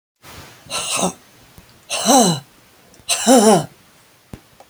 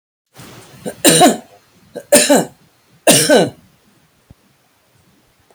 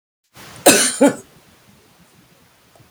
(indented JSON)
{
  "exhalation_length": "4.7 s",
  "exhalation_amplitude": 32768,
  "exhalation_signal_mean_std_ratio": 0.43,
  "three_cough_length": "5.5 s",
  "three_cough_amplitude": 32768,
  "three_cough_signal_mean_std_ratio": 0.37,
  "cough_length": "2.9 s",
  "cough_amplitude": 32768,
  "cough_signal_mean_std_ratio": 0.31,
  "survey_phase": "beta (2021-08-13 to 2022-03-07)",
  "age": "65+",
  "gender": "Female",
  "wearing_mask": "No",
  "symptom_none": true,
  "smoker_status": "Ex-smoker",
  "respiratory_condition_asthma": false,
  "respiratory_condition_other": false,
  "recruitment_source": "REACT",
  "submission_delay": "1 day",
  "covid_test_result": "Negative",
  "covid_test_method": "RT-qPCR"
}